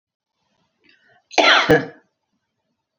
{"cough_length": "3.0 s", "cough_amplitude": 27444, "cough_signal_mean_std_ratio": 0.31, "survey_phase": "beta (2021-08-13 to 2022-03-07)", "age": "65+", "gender": "Female", "wearing_mask": "No", "symptom_none": true, "smoker_status": "Ex-smoker", "respiratory_condition_asthma": false, "respiratory_condition_other": false, "recruitment_source": "REACT", "submission_delay": "0 days", "covid_test_result": "Negative", "covid_test_method": "RT-qPCR", "influenza_a_test_result": "Negative", "influenza_b_test_result": "Negative"}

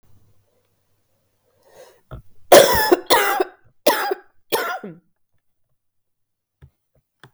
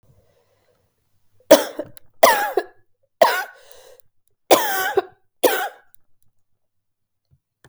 {"cough_length": "7.3 s", "cough_amplitude": 32768, "cough_signal_mean_std_ratio": 0.31, "three_cough_length": "7.7 s", "three_cough_amplitude": 32768, "three_cough_signal_mean_std_ratio": 0.3, "survey_phase": "beta (2021-08-13 to 2022-03-07)", "age": "18-44", "gender": "Female", "wearing_mask": "No", "symptom_cough_any": true, "symptom_new_continuous_cough": true, "symptom_runny_or_blocked_nose": true, "symptom_sore_throat": true, "symptom_fatigue": true, "symptom_fever_high_temperature": true, "symptom_onset": "3 days", "smoker_status": "Never smoked", "respiratory_condition_asthma": false, "respiratory_condition_other": false, "recruitment_source": "Test and Trace", "submission_delay": "1 day", "covid_test_result": "Negative", "covid_test_method": "LAMP"}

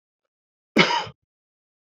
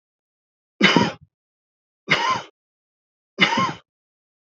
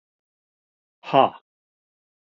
{"cough_length": "1.9 s", "cough_amplitude": 26000, "cough_signal_mean_std_ratio": 0.28, "three_cough_length": "4.4 s", "three_cough_amplitude": 28221, "three_cough_signal_mean_std_ratio": 0.35, "exhalation_length": "2.4 s", "exhalation_amplitude": 25327, "exhalation_signal_mean_std_ratio": 0.18, "survey_phase": "beta (2021-08-13 to 2022-03-07)", "age": "65+", "gender": "Male", "wearing_mask": "No", "symptom_none": true, "symptom_onset": "12 days", "smoker_status": "Never smoked", "respiratory_condition_asthma": false, "respiratory_condition_other": false, "recruitment_source": "REACT", "submission_delay": "3 days", "covid_test_result": "Negative", "covid_test_method": "RT-qPCR", "influenza_a_test_result": "Negative", "influenza_b_test_result": "Negative"}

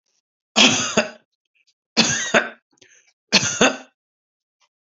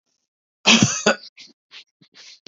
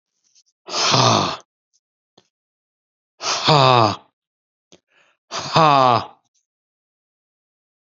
{"three_cough_length": "4.9 s", "three_cough_amplitude": 32767, "three_cough_signal_mean_std_ratio": 0.37, "cough_length": "2.5 s", "cough_amplitude": 31111, "cough_signal_mean_std_ratio": 0.32, "exhalation_length": "7.9 s", "exhalation_amplitude": 29093, "exhalation_signal_mean_std_ratio": 0.37, "survey_phase": "beta (2021-08-13 to 2022-03-07)", "age": "45-64", "gender": "Male", "wearing_mask": "No", "symptom_fatigue": true, "smoker_status": "Never smoked", "respiratory_condition_asthma": false, "respiratory_condition_other": false, "recruitment_source": "REACT", "submission_delay": "3 days", "covid_test_result": "Negative", "covid_test_method": "RT-qPCR"}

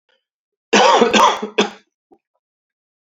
{"cough_length": "3.1 s", "cough_amplitude": 32768, "cough_signal_mean_std_ratio": 0.41, "survey_phase": "beta (2021-08-13 to 2022-03-07)", "age": "18-44", "gender": "Male", "wearing_mask": "No", "symptom_cough_any": true, "symptom_runny_or_blocked_nose": true, "symptom_sore_throat": true, "symptom_fatigue": true, "symptom_headache": true, "symptom_change_to_sense_of_smell_or_taste": true, "symptom_loss_of_taste": true, "symptom_onset": "4 days", "smoker_status": "Never smoked", "respiratory_condition_asthma": false, "respiratory_condition_other": false, "recruitment_source": "Test and Trace", "submission_delay": "1 day", "covid_test_result": "Positive", "covid_test_method": "RT-qPCR", "covid_ct_value": 19.6, "covid_ct_gene": "ORF1ab gene"}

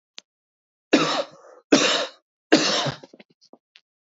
{"three_cough_length": "4.0 s", "three_cough_amplitude": 26043, "three_cough_signal_mean_std_ratio": 0.39, "survey_phase": "beta (2021-08-13 to 2022-03-07)", "age": "18-44", "gender": "Male", "wearing_mask": "No", "symptom_headache": true, "symptom_change_to_sense_of_smell_or_taste": true, "symptom_loss_of_taste": true, "symptom_other": true, "smoker_status": "Ex-smoker", "respiratory_condition_asthma": false, "respiratory_condition_other": false, "recruitment_source": "Test and Trace", "submission_delay": "1 day", "covid_test_result": "Positive", "covid_test_method": "RT-qPCR"}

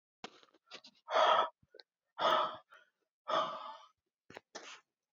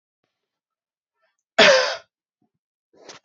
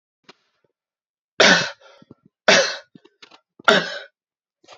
{"exhalation_length": "5.1 s", "exhalation_amplitude": 5385, "exhalation_signal_mean_std_ratio": 0.38, "cough_length": "3.2 s", "cough_amplitude": 30637, "cough_signal_mean_std_ratio": 0.26, "three_cough_length": "4.8 s", "three_cough_amplitude": 32768, "three_cough_signal_mean_std_ratio": 0.3, "survey_phase": "beta (2021-08-13 to 2022-03-07)", "age": "18-44", "gender": "Male", "wearing_mask": "No", "symptom_headache": true, "smoker_status": "Never smoked", "respiratory_condition_asthma": false, "respiratory_condition_other": false, "recruitment_source": "REACT", "submission_delay": "2 days", "covid_test_result": "Negative", "covid_test_method": "RT-qPCR", "influenza_a_test_result": "Negative", "influenza_b_test_result": "Negative"}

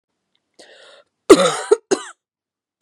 {"three_cough_length": "2.8 s", "three_cough_amplitude": 32768, "three_cough_signal_mean_std_ratio": 0.26, "survey_phase": "beta (2021-08-13 to 2022-03-07)", "age": "45-64", "gender": "Female", "wearing_mask": "No", "symptom_new_continuous_cough": true, "symptom_runny_or_blocked_nose": true, "symptom_shortness_of_breath": true, "symptom_sore_throat": true, "symptom_fatigue": true, "symptom_fever_high_temperature": true, "symptom_headache": true, "symptom_onset": "5 days", "smoker_status": "Ex-smoker", "respiratory_condition_asthma": false, "respiratory_condition_other": false, "recruitment_source": "Test and Trace", "submission_delay": "1 day", "covid_test_result": "Positive", "covid_test_method": "RT-qPCR", "covid_ct_value": 20.9, "covid_ct_gene": "ORF1ab gene"}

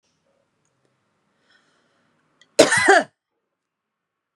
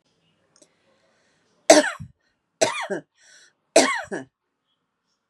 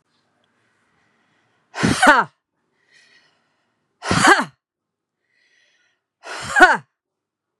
{"cough_length": "4.4 s", "cough_amplitude": 32768, "cough_signal_mean_std_ratio": 0.23, "three_cough_length": "5.3 s", "three_cough_amplitude": 32767, "three_cough_signal_mean_std_ratio": 0.25, "exhalation_length": "7.6 s", "exhalation_amplitude": 32767, "exhalation_signal_mean_std_ratio": 0.28, "survey_phase": "beta (2021-08-13 to 2022-03-07)", "age": "45-64", "gender": "Female", "wearing_mask": "No", "symptom_none": true, "symptom_onset": "6 days", "smoker_status": "Ex-smoker", "respiratory_condition_asthma": false, "respiratory_condition_other": false, "recruitment_source": "REACT", "submission_delay": "3 days", "covid_test_result": "Negative", "covid_test_method": "RT-qPCR", "influenza_a_test_result": "Negative", "influenza_b_test_result": "Negative"}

